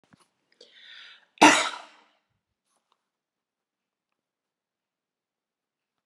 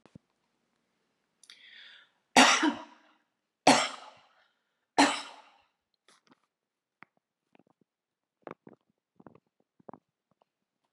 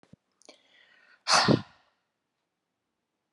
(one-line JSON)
{"cough_length": "6.1 s", "cough_amplitude": 27154, "cough_signal_mean_std_ratio": 0.16, "three_cough_length": "10.9 s", "three_cough_amplitude": 20804, "three_cough_signal_mean_std_ratio": 0.21, "exhalation_length": "3.3 s", "exhalation_amplitude": 12127, "exhalation_signal_mean_std_ratio": 0.24, "survey_phase": "alpha (2021-03-01 to 2021-08-12)", "age": "45-64", "gender": "Female", "wearing_mask": "No", "symptom_none": true, "smoker_status": "Ex-smoker", "respiratory_condition_asthma": false, "respiratory_condition_other": false, "recruitment_source": "REACT", "submission_delay": "1 day", "covid_test_result": "Negative", "covid_test_method": "RT-qPCR"}